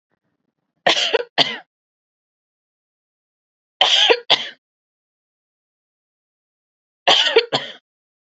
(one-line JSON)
{"three_cough_length": "8.3 s", "three_cough_amplitude": 32425, "three_cough_signal_mean_std_ratio": 0.31, "survey_phase": "beta (2021-08-13 to 2022-03-07)", "age": "18-44", "gender": "Female", "wearing_mask": "No", "symptom_fatigue": true, "symptom_onset": "3 days", "smoker_status": "Never smoked", "respiratory_condition_asthma": false, "respiratory_condition_other": false, "recruitment_source": "REACT", "submission_delay": "1 day", "covid_test_result": "Negative", "covid_test_method": "RT-qPCR", "influenza_a_test_result": "Negative", "influenza_b_test_result": "Negative"}